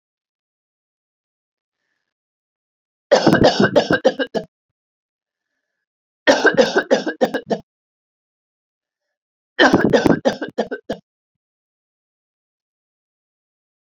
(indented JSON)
{
  "three_cough_length": "13.9 s",
  "three_cough_amplitude": 30774,
  "three_cough_signal_mean_std_ratio": 0.32,
  "survey_phase": "beta (2021-08-13 to 2022-03-07)",
  "age": "65+",
  "gender": "Female",
  "wearing_mask": "No",
  "symptom_none": true,
  "smoker_status": "Never smoked",
  "respiratory_condition_asthma": false,
  "respiratory_condition_other": false,
  "recruitment_source": "REACT",
  "submission_delay": "2 days",
  "covid_test_result": "Negative",
  "covid_test_method": "RT-qPCR",
  "influenza_a_test_result": "Negative",
  "influenza_b_test_result": "Negative"
}